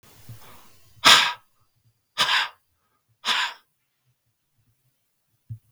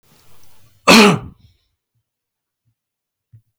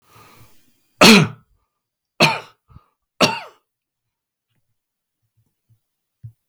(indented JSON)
{
  "exhalation_length": "5.7 s",
  "exhalation_amplitude": 32768,
  "exhalation_signal_mean_std_ratio": 0.28,
  "cough_length": "3.6 s",
  "cough_amplitude": 32768,
  "cough_signal_mean_std_ratio": 0.26,
  "three_cough_length": "6.5 s",
  "three_cough_amplitude": 32768,
  "three_cough_signal_mean_std_ratio": 0.23,
  "survey_phase": "beta (2021-08-13 to 2022-03-07)",
  "age": "45-64",
  "gender": "Male",
  "wearing_mask": "No",
  "symptom_none": true,
  "smoker_status": "Never smoked",
  "respiratory_condition_asthma": false,
  "respiratory_condition_other": false,
  "recruitment_source": "REACT",
  "submission_delay": "2 days",
  "covid_test_result": "Negative",
  "covid_test_method": "RT-qPCR",
  "influenza_a_test_result": "Negative",
  "influenza_b_test_result": "Negative"
}